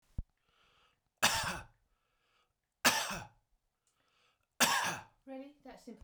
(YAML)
three_cough_length: 6.0 s
three_cough_amplitude: 10020
three_cough_signal_mean_std_ratio: 0.34
survey_phase: beta (2021-08-13 to 2022-03-07)
age: 45-64
gender: Male
wearing_mask: 'No'
symptom_runny_or_blocked_nose: true
symptom_fatigue: true
symptom_headache: true
symptom_onset: 12 days
smoker_status: Ex-smoker
respiratory_condition_asthma: false
respiratory_condition_other: false
recruitment_source: REACT
submission_delay: 2 days
covid_test_result: Negative
covid_test_method: RT-qPCR
influenza_a_test_result: Negative
influenza_b_test_result: Negative